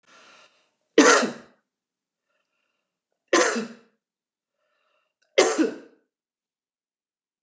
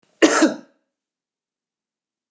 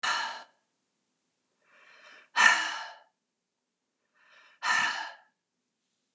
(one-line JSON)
{"three_cough_length": "7.4 s", "three_cough_amplitude": 25490, "three_cough_signal_mean_std_ratio": 0.27, "cough_length": "2.3 s", "cough_amplitude": 29175, "cough_signal_mean_std_ratio": 0.27, "exhalation_length": "6.1 s", "exhalation_amplitude": 16141, "exhalation_signal_mean_std_ratio": 0.32, "survey_phase": "beta (2021-08-13 to 2022-03-07)", "age": "65+", "gender": "Female", "wearing_mask": "No", "symptom_none": true, "smoker_status": "Never smoked", "respiratory_condition_asthma": false, "respiratory_condition_other": false, "recruitment_source": "REACT", "submission_delay": "1 day", "covid_test_result": "Negative", "covid_test_method": "RT-qPCR", "influenza_a_test_result": "Negative", "influenza_b_test_result": "Negative"}